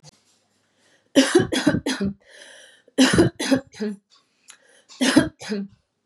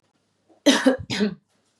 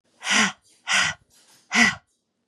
{"three_cough_length": "6.1 s", "three_cough_amplitude": 30222, "three_cough_signal_mean_std_ratio": 0.42, "cough_length": "1.8 s", "cough_amplitude": 28764, "cough_signal_mean_std_ratio": 0.4, "exhalation_length": "2.5 s", "exhalation_amplitude": 23808, "exhalation_signal_mean_std_ratio": 0.44, "survey_phase": "beta (2021-08-13 to 2022-03-07)", "age": "18-44", "gender": "Female", "wearing_mask": "No", "symptom_cough_any": true, "symptom_sore_throat": true, "symptom_headache": true, "symptom_onset": "2 days", "smoker_status": "Never smoked", "respiratory_condition_asthma": false, "respiratory_condition_other": false, "recruitment_source": "Test and Trace", "submission_delay": "2 days", "covid_test_result": "Positive", "covid_test_method": "RT-qPCR", "covid_ct_value": 30.8, "covid_ct_gene": "ORF1ab gene", "covid_ct_mean": 31.1, "covid_viral_load": "64 copies/ml", "covid_viral_load_category": "Minimal viral load (< 10K copies/ml)"}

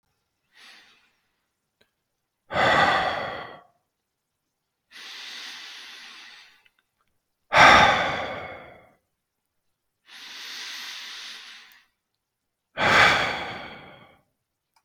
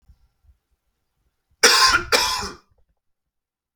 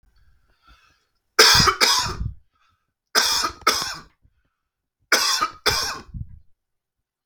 {"exhalation_length": "14.8 s", "exhalation_amplitude": 31381, "exhalation_signal_mean_std_ratio": 0.33, "cough_length": "3.8 s", "cough_amplitude": 32768, "cough_signal_mean_std_ratio": 0.34, "three_cough_length": "7.3 s", "three_cough_amplitude": 32768, "three_cough_signal_mean_std_ratio": 0.41, "survey_phase": "beta (2021-08-13 to 2022-03-07)", "age": "18-44", "gender": "Male", "wearing_mask": "No", "symptom_none": true, "smoker_status": "Ex-smoker", "respiratory_condition_asthma": false, "respiratory_condition_other": false, "recruitment_source": "REACT", "submission_delay": "6 days", "covid_test_result": "Negative", "covid_test_method": "RT-qPCR", "influenza_a_test_result": "Negative", "influenza_b_test_result": "Negative"}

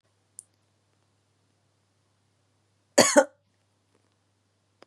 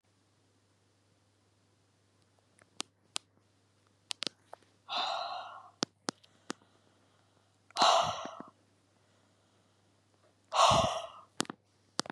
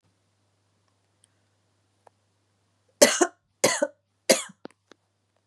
{"cough_length": "4.9 s", "cough_amplitude": 28802, "cough_signal_mean_std_ratio": 0.16, "exhalation_length": "12.1 s", "exhalation_amplitude": 17379, "exhalation_signal_mean_std_ratio": 0.27, "three_cough_length": "5.5 s", "three_cough_amplitude": 30567, "three_cough_signal_mean_std_ratio": 0.21, "survey_phase": "beta (2021-08-13 to 2022-03-07)", "age": "45-64", "gender": "Female", "wearing_mask": "No", "symptom_cough_any": true, "symptom_runny_or_blocked_nose": true, "symptom_sore_throat": true, "symptom_headache": true, "smoker_status": "Never smoked", "respiratory_condition_asthma": false, "respiratory_condition_other": false, "recruitment_source": "Test and Trace", "submission_delay": "0 days", "covid_test_result": "Positive", "covid_test_method": "LFT"}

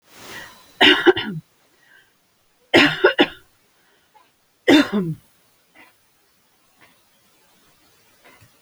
{"three_cough_length": "8.6 s", "three_cough_amplitude": 29060, "three_cough_signal_mean_std_ratio": 0.3, "survey_phase": "alpha (2021-03-01 to 2021-08-12)", "age": "65+", "gender": "Female", "wearing_mask": "No", "symptom_cough_any": true, "symptom_fatigue": true, "smoker_status": "Ex-smoker", "respiratory_condition_asthma": false, "respiratory_condition_other": false, "recruitment_source": "REACT", "submission_delay": "2 days", "covid_test_result": "Negative", "covid_test_method": "RT-qPCR"}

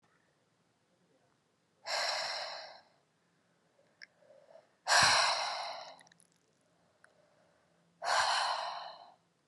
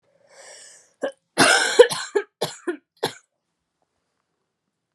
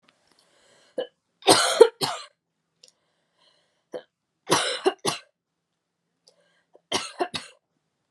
{"exhalation_length": "9.5 s", "exhalation_amplitude": 6781, "exhalation_signal_mean_std_ratio": 0.39, "cough_length": "4.9 s", "cough_amplitude": 32768, "cough_signal_mean_std_ratio": 0.29, "three_cough_length": "8.1 s", "three_cough_amplitude": 31205, "three_cough_signal_mean_std_ratio": 0.26, "survey_phase": "beta (2021-08-13 to 2022-03-07)", "age": "18-44", "gender": "Female", "wearing_mask": "No", "symptom_cough_any": true, "symptom_runny_or_blocked_nose": true, "symptom_fatigue": true, "symptom_fever_high_temperature": true, "symptom_headache": true, "symptom_change_to_sense_of_smell_or_taste": true, "symptom_other": true, "smoker_status": "Never smoked", "respiratory_condition_asthma": false, "respiratory_condition_other": false, "recruitment_source": "Test and Trace", "submission_delay": "2 days", "covid_test_result": "Positive", "covid_test_method": "LFT"}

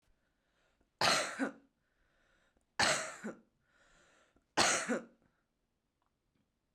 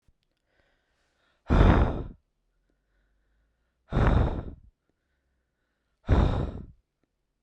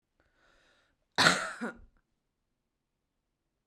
{"three_cough_length": "6.7 s", "three_cough_amplitude": 5822, "three_cough_signal_mean_std_ratio": 0.33, "exhalation_length": "7.4 s", "exhalation_amplitude": 16584, "exhalation_signal_mean_std_ratio": 0.35, "cough_length": "3.7 s", "cough_amplitude": 18489, "cough_signal_mean_std_ratio": 0.23, "survey_phase": "beta (2021-08-13 to 2022-03-07)", "age": "18-44", "gender": "Female", "wearing_mask": "No", "symptom_runny_or_blocked_nose": true, "smoker_status": "Current smoker (1 to 10 cigarettes per day)", "respiratory_condition_asthma": false, "respiratory_condition_other": false, "recruitment_source": "REACT", "submission_delay": "2 days", "covid_test_result": "Negative", "covid_test_method": "RT-qPCR", "influenza_a_test_result": "Negative", "influenza_b_test_result": "Negative"}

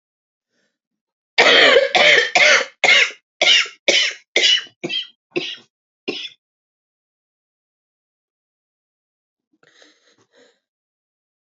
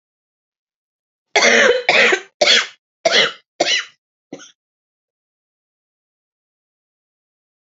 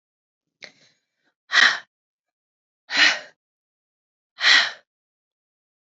{"three_cough_length": "11.5 s", "three_cough_amplitude": 32125, "three_cough_signal_mean_std_ratio": 0.37, "cough_length": "7.7 s", "cough_amplitude": 31761, "cough_signal_mean_std_ratio": 0.35, "exhalation_length": "6.0 s", "exhalation_amplitude": 26625, "exhalation_signal_mean_std_ratio": 0.27, "survey_phase": "alpha (2021-03-01 to 2021-08-12)", "age": "18-44", "gender": "Female", "wearing_mask": "No", "symptom_new_continuous_cough": true, "symptom_diarrhoea": true, "symptom_fatigue": true, "symptom_fever_high_temperature": true, "symptom_headache": true, "symptom_change_to_sense_of_smell_or_taste": true, "symptom_loss_of_taste": true, "symptom_onset": "4 days", "smoker_status": "Current smoker (e-cigarettes or vapes only)", "respiratory_condition_asthma": false, "respiratory_condition_other": false, "recruitment_source": "Test and Trace", "submission_delay": "2 days", "covid_test_result": "Positive", "covid_test_method": "RT-qPCR", "covid_ct_value": 24.0, "covid_ct_gene": "ORF1ab gene", "covid_ct_mean": 25.0, "covid_viral_load": "6100 copies/ml", "covid_viral_load_category": "Minimal viral load (< 10K copies/ml)"}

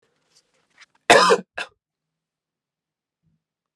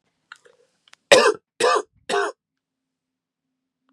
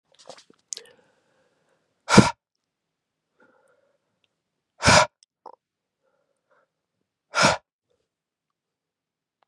{"cough_length": "3.8 s", "cough_amplitude": 32767, "cough_signal_mean_std_ratio": 0.22, "three_cough_length": "3.9 s", "three_cough_amplitude": 32768, "three_cough_signal_mean_std_ratio": 0.3, "exhalation_length": "9.5 s", "exhalation_amplitude": 32768, "exhalation_signal_mean_std_ratio": 0.19, "survey_phase": "beta (2021-08-13 to 2022-03-07)", "age": "18-44", "gender": "Male", "wearing_mask": "No", "symptom_cough_any": true, "symptom_runny_or_blocked_nose": true, "symptom_sore_throat": true, "symptom_headache": true, "symptom_change_to_sense_of_smell_or_taste": true, "symptom_onset": "4 days", "smoker_status": "Never smoked", "respiratory_condition_asthma": false, "respiratory_condition_other": false, "recruitment_source": "Test and Trace", "submission_delay": "1 day", "covid_test_result": "Positive", "covid_test_method": "RT-qPCR", "covid_ct_value": 14.9, "covid_ct_gene": "ORF1ab gene", "covid_ct_mean": 15.0, "covid_viral_load": "12000000 copies/ml", "covid_viral_load_category": "High viral load (>1M copies/ml)"}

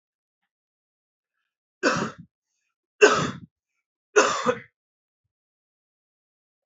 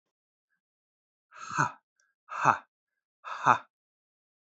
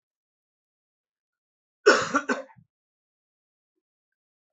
{"three_cough_length": "6.7 s", "three_cough_amplitude": 26245, "three_cough_signal_mean_std_ratio": 0.26, "exhalation_length": "4.5 s", "exhalation_amplitude": 16811, "exhalation_signal_mean_std_ratio": 0.24, "cough_length": "4.5 s", "cough_amplitude": 19714, "cough_signal_mean_std_ratio": 0.2, "survey_phase": "beta (2021-08-13 to 2022-03-07)", "age": "18-44", "gender": "Male", "wearing_mask": "No", "symptom_cough_any": true, "symptom_new_continuous_cough": true, "symptom_runny_or_blocked_nose": true, "symptom_sore_throat": true, "symptom_fatigue": true, "symptom_onset": "2 days", "smoker_status": "Never smoked", "respiratory_condition_asthma": false, "respiratory_condition_other": false, "recruitment_source": "Test and Trace", "submission_delay": "2 days", "covid_test_result": "Positive", "covid_test_method": "ePCR"}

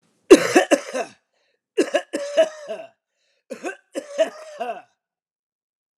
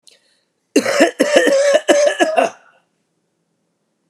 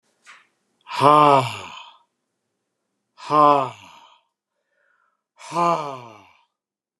{"three_cough_length": "6.0 s", "three_cough_amplitude": 32768, "three_cough_signal_mean_std_ratio": 0.31, "cough_length": "4.1 s", "cough_amplitude": 32768, "cough_signal_mean_std_ratio": 0.51, "exhalation_length": "7.0 s", "exhalation_amplitude": 29786, "exhalation_signal_mean_std_ratio": 0.32, "survey_phase": "alpha (2021-03-01 to 2021-08-12)", "age": "65+", "gender": "Male", "wearing_mask": "No", "symptom_cough_any": true, "symptom_new_continuous_cough": true, "symptom_fatigue": true, "symptom_headache": true, "smoker_status": "Never smoked", "respiratory_condition_asthma": false, "respiratory_condition_other": false, "recruitment_source": "Test and Trace", "submission_delay": "1 day", "covid_test_result": "Positive", "covid_test_method": "RT-qPCR", "covid_ct_value": 23.4, "covid_ct_gene": "ORF1ab gene", "covid_ct_mean": 24.0, "covid_viral_load": "14000 copies/ml", "covid_viral_load_category": "Low viral load (10K-1M copies/ml)"}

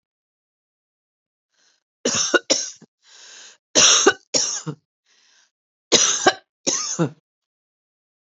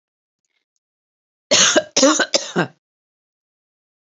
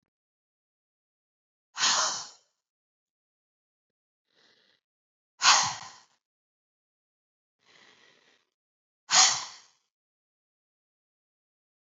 {"three_cough_length": "8.4 s", "three_cough_amplitude": 32768, "three_cough_signal_mean_std_ratio": 0.35, "cough_length": "4.0 s", "cough_amplitude": 30756, "cough_signal_mean_std_ratio": 0.34, "exhalation_length": "11.9 s", "exhalation_amplitude": 16087, "exhalation_signal_mean_std_ratio": 0.22, "survey_phase": "alpha (2021-03-01 to 2021-08-12)", "age": "45-64", "gender": "Female", "wearing_mask": "No", "symptom_none": true, "smoker_status": "Never smoked", "respiratory_condition_asthma": false, "respiratory_condition_other": false, "recruitment_source": "REACT", "submission_delay": "1 day", "covid_test_result": "Negative", "covid_test_method": "RT-qPCR"}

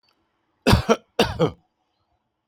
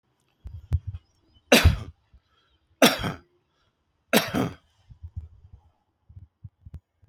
{"cough_length": "2.5 s", "cough_amplitude": 32767, "cough_signal_mean_std_ratio": 0.33, "three_cough_length": "7.1 s", "three_cough_amplitude": 27985, "three_cough_signal_mean_std_ratio": 0.27, "survey_phase": "beta (2021-08-13 to 2022-03-07)", "age": "45-64", "gender": "Male", "wearing_mask": "No", "symptom_none": true, "smoker_status": "Current smoker (1 to 10 cigarettes per day)", "respiratory_condition_asthma": false, "respiratory_condition_other": false, "recruitment_source": "REACT", "submission_delay": "0 days", "covid_test_result": "Negative", "covid_test_method": "RT-qPCR", "influenza_a_test_result": "Negative", "influenza_b_test_result": "Negative"}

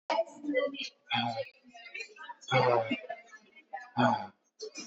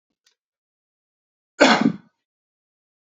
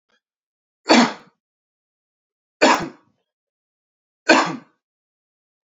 {"exhalation_length": "4.9 s", "exhalation_amplitude": 7117, "exhalation_signal_mean_std_ratio": 0.53, "cough_length": "3.1 s", "cough_amplitude": 32249, "cough_signal_mean_std_ratio": 0.23, "three_cough_length": "5.6 s", "three_cough_amplitude": 30540, "three_cough_signal_mean_std_ratio": 0.26, "survey_phase": "alpha (2021-03-01 to 2021-08-12)", "age": "18-44", "gender": "Male", "wearing_mask": "Yes", "symptom_none": true, "smoker_status": "Never smoked", "respiratory_condition_asthma": false, "respiratory_condition_other": false, "recruitment_source": "REACT", "submission_delay": "1 day", "covid_test_result": "Negative", "covid_test_method": "RT-qPCR"}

